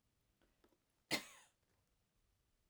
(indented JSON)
{
  "cough_length": "2.7 s",
  "cough_amplitude": 1698,
  "cough_signal_mean_std_ratio": 0.19,
  "survey_phase": "alpha (2021-03-01 to 2021-08-12)",
  "age": "45-64",
  "gender": "Female",
  "wearing_mask": "No",
  "symptom_none": true,
  "smoker_status": "Ex-smoker",
  "respiratory_condition_asthma": true,
  "respiratory_condition_other": false,
  "recruitment_source": "REACT",
  "submission_delay": "1 day",
  "covid_test_result": "Negative",
  "covid_test_method": "RT-qPCR"
}